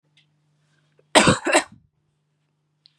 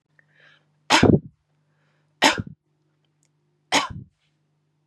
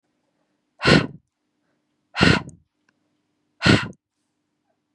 {"cough_length": "3.0 s", "cough_amplitude": 32767, "cough_signal_mean_std_ratio": 0.27, "three_cough_length": "4.9 s", "three_cough_amplitude": 30753, "three_cough_signal_mean_std_ratio": 0.26, "exhalation_length": "4.9 s", "exhalation_amplitude": 28881, "exhalation_signal_mean_std_ratio": 0.28, "survey_phase": "beta (2021-08-13 to 2022-03-07)", "age": "18-44", "gender": "Female", "wearing_mask": "No", "symptom_none": true, "smoker_status": "Never smoked", "respiratory_condition_asthma": false, "respiratory_condition_other": false, "recruitment_source": "REACT", "submission_delay": "1 day", "covid_test_result": "Negative", "covid_test_method": "RT-qPCR", "influenza_a_test_result": "Negative", "influenza_b_test_result": "Negative"}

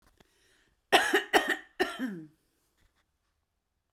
{"three_cough_length": "3.9 s", "three_cough_amplitude": 14361, "three_cough_signal_mean_std_ratio": 0.32, "survey_phase": "beta (2021-08-13 to 2022-03-07)", "age": "45-64", "gender": "Female", "wearing_mask": "No", "symptom_none": true, "smoker_status": "Current smoker (1 to 10 cigarettes per day)", "respiratory_condition_asthma": false, "respiratory_condition_other": false, "recruitment_source": "REACT", "submission_delay": "0 days", "covid_test_result": "Negative", "covid_test_method": "RT-qPCR"}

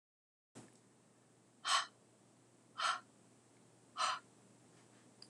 {"exhalation_length": "5.3 s", "exhalation_amplitude": 2913, "exhalation_signal_mean_std_ratio": 0.32, "survey_phase": "alpha (2021-03-01 to 2021-08-12)", "age": "45-64", "gender": "Female", "wearing_mask": "No", "symptom_none": true, "smoker_status": "Ex-smoker", "respiratory_condition_asthma": false, "respiratory_condition_other": false, "recruitment_source": "REACT", "submission_delay": "1 day", "covid_test_result": "Negative", "covid_test_method": "RT-qPCR"}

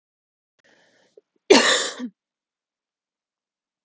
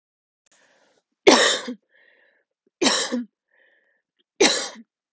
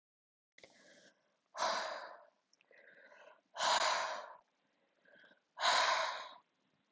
{"cough_length": "3.8 s", "cough_amplitude": 31925, "cough_signal_mean_std_ratio": 0.24, "three_cough_length": "5.1 s", "three_cough_amplitude": 31947, "three_cough_signal_mean_std_ratio": 0.32, "exhalation_length": "6.9 s", "exhalation_amplitude": 3629, "exhalation_signal_mean_std_ratio": 0.42, "survey_phase": "alpha (2021-03-01 to 2021-08-12)", "age": "18-44", "gender": "Female", "wearing_mask": "No", "symptom_none": true, "smoker_status": "Never smoked", "respiratory_condition_asthma": false, "respiratory_condition_other": false, "recruitment_source": "REACT", "submission_delay": "1 day", "covid_test_result": "Negative", "covid_test_method": "RT-qPCR"}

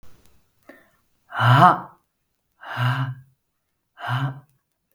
{"exhalation_length": "4.9 s", "exhalation_amplitude": 32766, "exhalation_signal_mean_std_ratio": 0.35, "survey_phase": "beta (2021-08-13 to 2022-03-07)", "age": "18-44", "gender": "Female", "wearing_mask": "No", "symptom_none": true, "smoker_status": "Never smoked", "respiratory_condition_asthma": false, "respiratory_condition_other": false, "recruitment_source": "REACT", "submission_delay": "1 day", "covid_test_result": "Negative", "covid_test_method": "RT-qPCR"}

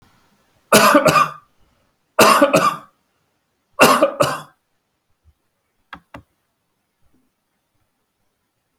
{"three_cough_length": "8.8 s", "three_cough_amplitude": 32768, "three_cough_signal_mean_std_ratio": 0.33, "survey_phase": "beta (2021-08-13 to 2022-03-07)", "age": "65+", "gender": "Male", "wearing_mask": "No", "symptom_none": true, "smoker_status": "Ex-smoker", "respiratory_condition_asthma": false, "respiratory_condition_other": false, "recruitment_source": "REACT", "submission_delay": "5 days", "covid_test_result": "Negative", "covid_test_method": "RT-qPCR"}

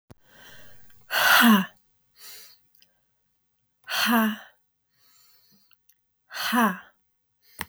{"exhalation_length": "7.7 s", "exhalation_amplitude": 18746, "exhalation_signal_mean_std_ratio": 0.35, "survey_phase": "beta (2021-08-13 to 2022-03-07)", "age": "45-64", "gender": "Female", "wearing_mask": "No", "symptom_cough_any": true, "symptom_new_continuous_cough": true, "symptom_runny_or_blocked_nose": true, "symptom_fatigue": true, "symptom_headache": true, "symptom_change_to_sense_of_smell_or_taste": true, "symptom_loss_of_taste": true, "symptom_onset": "5 days", "smoker_status": "Ex-smoker", "respiratory_condition_asthma": false, "respiratory_condition_other": false, "recruitment_source": "Test and Trace", "submission_delay": "1 day", "covid_test_result": "Positive", "covid_test_method": "RT-qPCR", "covid_ct_value": 15.8, "covid_ct_gene": "ORF1ab gene"}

